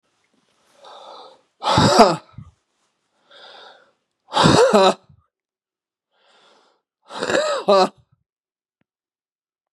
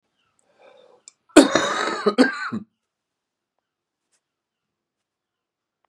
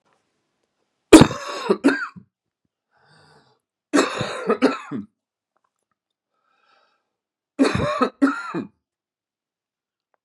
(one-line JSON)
{"exhalation_length": "9.7 s", "exhalation_amplitude": 32768, "exhalation_signal_mean_std_ratio": 0.33, "cough_length": "5.9 s", "cough_amplitude": 32768, "cough_signal_mean_std_ratio": 0.26, "three_cough_length": "10.2 s", "three_cough_amplitude": 32768, "three_cough_signal_mean_std_ratio": 0.28, "survey_phase": "beta (2021-08-13 to 2022-03-07)", "age": "45-64", "gender": "Male", "wearing_mask": "No", "symptom_cough_any": true, "symptom_sore_throat": true, "symptom_fatigue": true, "symptom_onset": "3 days", "smoker_status": "Ex-smoker", "respiratory_condition_asthma": false, "respiratory_condition_other": false, "recruitment_source": "Test and Trace", "submission_delay": "2 days", "covid_test_result": "Positive", "covid_test_method": "RT-qPCR", "covid_ct_value": 18.1, "covid_ct_gene": "N gene", "covid_ct_mean": 18.8, "covid_viral_load": "660000 copies/ml", "covid_viral_load_category": "Low viral load (10K-1M copies/ml)"}